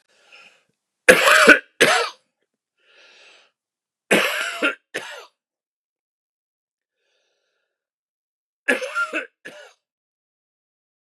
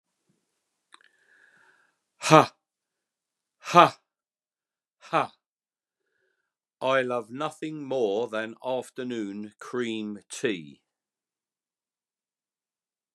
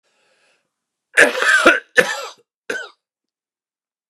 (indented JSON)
{
  "three_cough_length": "11.0 s",
  "three_cough_amplitude": 32768,
  "three_cough_signal_mean_std_ratio": 0.28,
  "exhalation_length": "13.1 s",
  "exhalation_amplitude": 32281,
  "exhalation_signal_mean_std_ratio": 0.28,
  "cough_length": "4.1 s",
  "cough_amplitude": 32768,
  "cough_signal_mean_std_ratio": 0.34,
  "survey_phase": "beta (2021-08-13 to 2022-03-07)",
  "age": "65+",
  "gender": "Male",
  "wearing_mask": "No",
  "symptom_cough_any": true,
  "symptom_fatigue": true,
  "symptom_headache": true,
  "symptom_change_to_sense_of_smell_or_taste": true,
  "smoker_status": "Never smoked",
  "respiratory_condition_asthma": false,
  "respiratory_condition_other": false,
  "recruitment_source": "Test and Trace",
  "submission_delay": "0 days",
  "covid_test_result": "Positive",
  "covid_test_method": "LFT"
}